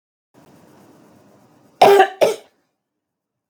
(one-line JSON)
{"cough_length": "3.5 s", "cough_amplitude": 32768, "cough_signal_mean_std_ratio": 0.28, "survey_phase": "beta (2021-08-13 to 2022-03-07)", "age": "45-64", "gender": "Female", "wearing_mask": "No", "symptom_runny_or_blocked_nose": true, "symptom_fatigue": true, "symptom_headache": true, "smoker_status": "Ex-smoker", "respiratory_condition_asthma": false, "respiratory_condition_other": false, "recruitment_source": "Test and Trace", "submission_delay": "2 days", "covid_test_result": "Positive", "covid_test_method": "RT-qPCR", "covid_ct_value": 20.6, "covid_ct_gene": "N gene"}